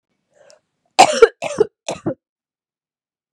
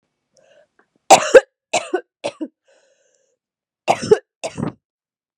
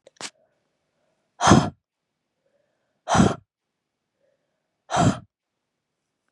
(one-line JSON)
{"cough_length": "3.3 s", "cough_amplitude": 32768, "cough_signal_mean_std_ratio": 0.25, "three_cough_length": "5.4 s", "three_cough_amplitude": 32768, "three_cough_signal_mean_std_ratio": 0.24, "exhalation_length": "6.3 s", "exhalation_amplitude": 28787, "exhalation_signal_mean_std_ratio": 0.26, "survey_phase": "beta (2021-08-13 to 2022-03-07)", "age": "18-44", "gender": "Female", "wearing_mask": "No", "symptom_cough_any": true, "symptom_runny_or_blocked_nose": true, "symptom_sore_throat": true, "symptom_other": true, "smoker_status": "Never smoked", "respiratory_condition_asthma": false, "respiratory_condition_other": false, "recruitment_source": "Test and Trace", "submission_delay": "1 day", "covid_test_result": "Positive", "covid_test_method": "RT-qPCR", "covid_ct_value": 29.5, "covid_ct_gene": "N gene"}